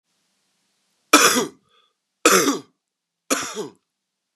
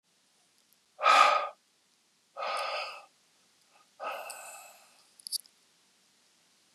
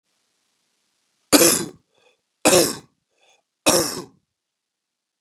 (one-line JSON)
{"cough_length": "4.4 s", "cough_amplitude": 32768, "cough_signal_mean_std_ratio": 0.33, "exhalation_length": "6.7 s", "exhalation_amplitude": 12175, "exhalation_signal_mean_std_ratio": 0.3, "three_cough_length": "5.2 s", "three_cough_amplitude": 32768, "three_cough_signal_mean_std_ratio": 0.3, "survey_phase": "beta (2021-08-13 to 2022-03-07)", "age": "45-64", "gender": "Male", "wearing_mask": "No", "symptom_cough_any": true, "symptom_new_continuous_cough": true, "symptom_shortness_of_breath": true, "symptom_fatigue": true, "symptom_fever_high_temperature": true, "symptom_headache": true, "symptom_change_to_sense_of_smell_or_taste": true, "symptom_other": true, "smoker_status": "Never smoked", "respiratory_condition_asthma": false, "respiratory_condition_other": false, "recruitment_source": "Test and Trace", "submission_delay": "2 days", "covid_test_result": "Positive", "covid_test_method": "RT-qPCR", "covid_ct_value": 23.5, "covid_ct_gene": "N gene"}